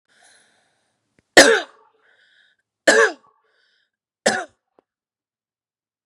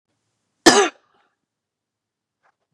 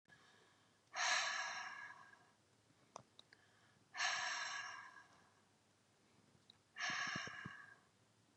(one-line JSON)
{"three_cough_length": "6.1 s", "three_cough_amplitude": 32768, "three_cough_signal_mean_std_ratio": 0.23, "cough_length": "2.7 s", "cough_amplitude": 32768, "cough_signal_mean_std_ratio": 0.21, "exhalation_length": "8.4 s", "exhalation_amplitude": 1691, "exhalation_signal_mean_std_ratio": 0.48, "survey_phase": "beta (2021-08-13 to 2022-03-07)", "age": "45-64", "gender": "Female", "wearing_mask": "No", "symptom_none": true, "smoker_status": "Never smoked", "respiratory_condition_asthma": false, "respiratory_condition_other": false, "recruitment_source": "REACT", "submission_delay": "4 days", "covid_test_result": "Negative", "covid_test_method": "RT-qPCR", "influenza_a_test_result": "Negative", "influenza_b_test_result": "Negative"}